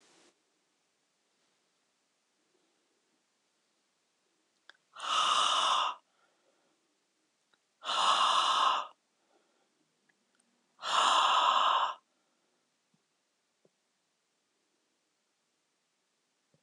{"exhalation_length": "16.6 s", "exhalation_amplitude": 6810, "exhalation_signal_mean_std_ratio": 0.35, "survey_phase": "beta (2021-08-13 to 2022-03-07)", "age": "45-64", "gender": "Male", "wearing_mask": "No", "symptom_none": true, "smoker_status": "Never smoked", "respiratory_condition_asthma": false, "respiratory_condition_other": true, "recruitment_source": "REACT", "submission_delay": "2 days", "covid_test_result": "Negative", "covid_test_method": "RT-qPCR", "influenza_a_test_result": "Negative", "influenza_b_test_result": "Negative"}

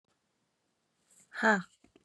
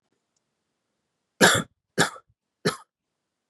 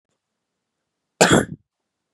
{"exhalation_length": "2.0 s", "exhalation_amplitude": 8260, "exhalation_signal_mean_std_ratio": 0.26, "three_cough_length": "3.5 s", "three_cough_amplitude": 28817, "three_cough_signal_mean_std_ratio": 0.25, "cough_length": "2.1 s", "cough_amplitude": 31685, "cough_signal_mean_std_ratio": 0.25, "survey_phase": "beta (2021-08-13 to 2022-03-07)", "age": "18-44", "gender": "Female", "wearing_mask": "No", "symptom_cough_any": true, "symptom_runny_or_blocked_nose": true, "symptom_sore_throat": true, "symptom_abdominal_pain": true, "symptom_diarrhoea": true, "symptom_fatigue": true, "symptom_headache": true, "symptom_change_to_sense_of_smell_or_taste": true, "symptom_other": true, "symptom_onset": "4 days", "smoker_status": "Ex-smoker", "respiratory_condition_asthma": false, "respiratory_condition_other": false, "recruitment_source": "Test and Trace", "submission_delay": "2 days", "covid_test_result": "Positive", "covid_test_method": "RT-qPCR", "covid_ct_value": 24.4, "covid_ct_gene": "ORF1ab gene", "covid_ct_mean": 24.6, "covid_viral_load": "8600 copies/ml", "covid_viral_load_category": "Minimal viral load (< 10K copies/ml)"}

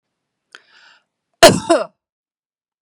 {"cough_length": "2.8 s", "cough_amplitude": 32768, "cough_signal_mean_std_ratio": 0.24, "survey_phase": "beta (2021-08-13 to 2022-03-07)", "age": "65+", "gender": "Female", "wearing_mask": "No", "symptom_none": true, "smoker_status": "Ex-smoker", "respiratory_condition_asthma": false, "respiratory_condition_other": false, "recruitment_source": "REACT", "submission_delay": "1 day", "covid_test_result": "Negative", "covid_test_method": "RT-qPCR"}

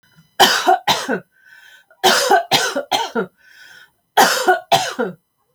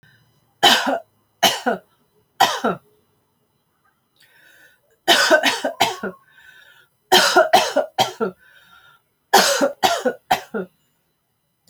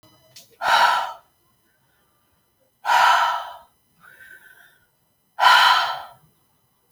{"cough_length": "5.5 s", "cough_amplitude": 32346, "cough_signal_mean_std_ratio": 0.52, "three_cough_length": "11.7 s", "three_cough_amplitude": 31203, "three_cough_signal_mean_std_ratio": 0.41, "exhalation_length": "6.9 s", "exhalation_amplitude": 25945, "exhalation_signal_mean_std_ratio": 0.4, "survey_phase": "alpha (2021-03-01 to 2021-08-12)", "age": "45-64", "gender": "Female", "wearing_mask": "No", "symptom_none": true, "smoker_status": "Never smoked", "respiratory_condition_asthma": true, "respiratory_condition_other": false, "recruitment_source": "REACT", "submission_delay": "1 day", "covid_test_result": "Negative", "covid_test_method": "RT-qPCR"}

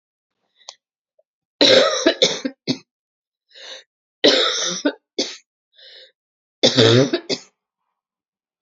{"cough_length": "8.6 s", "cough_amplitude": 32017, "cough_signal_mean_std_ratio": 0.38, "survey_phase": "beta (2021-08-13 to 2022-03-07)", "age": "18-44", "gender": "Female", "wearing_mask": "No", "symptom_cough_any": true, "symptom_sore_throat": true, "symptom_diarrhoea": true, "symptom_fatigue": true, "symptom_fever_high_temperature": true, "smoker_status": "Ex-smoker", "respiratory_condition_asthma": false, "respiratory_condition_other": false, "recruitment_source": "Test and Trace", "submission_delay": "2 days", "covid_test_result": "Positive", "covid_test_method": "RT-qPCR", "covid_ct_value": 25.3, "covid_ct_gene": "ORF1ab gene"}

